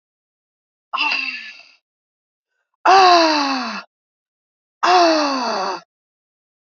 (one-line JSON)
{"exhalation_length": "6.7 s", "exhalation_amplitude": 32767, "exhalation_signal_mean_std_ratio": 0.45, "survey_phase": "beta (2021-08-13 to 2022-03-07)", "age": "45-64", "gender": "Female", "wearing_mask": "No", "symptom_cough_any": true, "smoker_status": "Never smoked", "respiratory_condition_asthma": true, "respiratory_condition_other": false, "recruitment_source": "Test and Trace", "submission_delay": "2 days", "covid_test_result": "Positive", "covid_test_method": "RT-qPCR", "covid_ct_value": 35.3, "covid_ct_gene": "ORF1ab gene"}